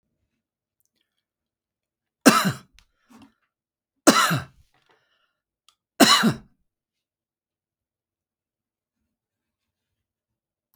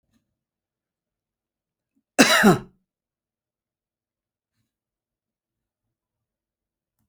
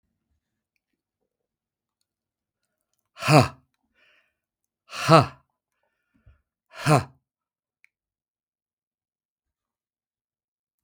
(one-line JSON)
{"three_cough_length": "10.8 s", "three_cough_amplitude": 32768, "three_cough_signal_mean_std_ratio": 0.21, "cough_length": "7.1 s", "cough_amplitude": 32768, "cough_signal_mean_std_ratio": 0.18, "exhalation_length": "10.8 s", "exhalation_amplitude": 32768, "exhalation_signal_mean_std_ratio": 0.18, "survey_phase": "beta (2021-08-13 to 2022-03-07)", "age": "65+", "gender": "Male", "wearing_mask": "No", "symptom_none": true, "symptom_onset": "7 days", "smoker_status": "Ex-smoker", "respiratory_condition_asthma": false, "respiratory_condition_other": false, "recruitment_source": "REACT", "submission_delay": "2 days", "covid_test_result": "Negative", "covid_test_method": "RT-qPCR", "influenza_a_test_result": "Negative", "influenza_b_test_result": "Negative"}